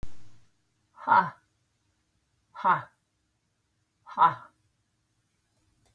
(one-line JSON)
{"exhalation_length": "5.9 s", "exhalation_amplitude": 13278, "exhalation_signal_mean_std_ratio": 0.28, "survey_phase": "beta (2021-08-13 to 2022-03-07)", "age": "45-64", "gender": "Female", "wearing_mask": "No", "symptom_none": true, "smoker_status": "Never smoked", "respiratory_condition_asthma": false, "respiratory_condition_other": false, "recruitment_source": "REACT", "submission_delay": "-2 days", "covid_test_result": "Negative", "covid_test_method": "RT-qPCR", "influenza_a_test_result": "Negative", "influenza_b_test_result": "Negative"}